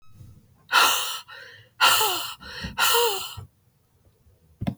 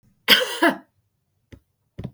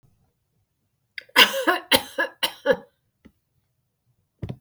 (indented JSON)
{
  "exhalation_length": "4.8 s",
  "exhalation_amplitude": 18833,
  "exhalation_signal_mean_std_ratio": 0.49,
  "cough_length": "2.1 s",
  "cough_amplitude": 32767,
  "cough_signal_mean_std_ratio": 0.32,
  "three_cough_length": "4.6 s",
  "three_cough_amplitude": 32768,
  "three_cough_signal_mean_std_ratio": 0.29,
  "survey_phase": "beta (2021-08-13 to 2022-03-07)",
  "age": "45-64",
  "gender": "Female",
  "wearing_mask": "No",
  "symptom_change_to_sense_of_smell_or_taste": true,
  "smoker_status": "Ex-smoker",
  "respiratory_condition_asthma": false,
  "respiratory_condition_other": false,
  "recruitment_source": "REACT",
  "submission_delay": "2 days",
  "covid_test_result": "Negative",
  "covid_test_method": "RT-qPCR",
  "influenza_a_test_result": "Negative",
  "influenza_b_test_result": "Negative"
}